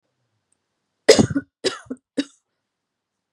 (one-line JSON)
{"three_cough_length": "3.3 s", "three_cough_amplitude": 32767, "three_cough_signal_mean_std_ratio": 0.23, "survey_phase": "beta (2021-08-13 to 2022-03-07)", "age": "18-44", "gender": "Female", "wearing_mask": "No", "symptom_none": true, "smoker_status": "Never smoked", "respiratory_condition_asthma": false, "respiratory_condition_other": false, "recruitment_source": "REACT", "submission_delay": "2 days", "covid_test_result": "Negative", "covid_test_method": "RT-qPCR", "influenza_a_test_result": "Negative", "influenza_b_test_result": "Negative"}